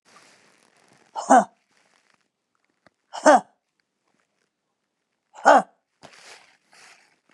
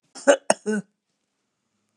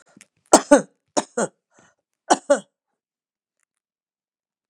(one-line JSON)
{"exhalation_length": "7.3 s", "exhalation_amplitude": 28804, "exhalation_signal_mean_std_ratio": 0.21, "cough_length": "2.0 s", "cough_amplitude": 30793, "cough_signal_mean_std_ratio": 0.26, "three_cough_length": "4.7 s", "three_cough_amplitude": 32768, "three_cough_signal_mean_std_ratio": 0.21, "survey_phase": "beta (2021-08-13 to 2022-03-07)", "age": "65+", "gender": "Female", "wearing_mask": "No", "symptom_none": true, "smoker_status": "Never smoked", "respiratory_condition_asthma": false, "respiratory_condition_other": false, "recruitment_source": "REACT", "submission_delay": "1 day", "covid_test_result": "Negative", "covid_test_method": "RT-qPCR", "influenza_a_test_result": "Negative", "influenza_b_test_result": "Negative"}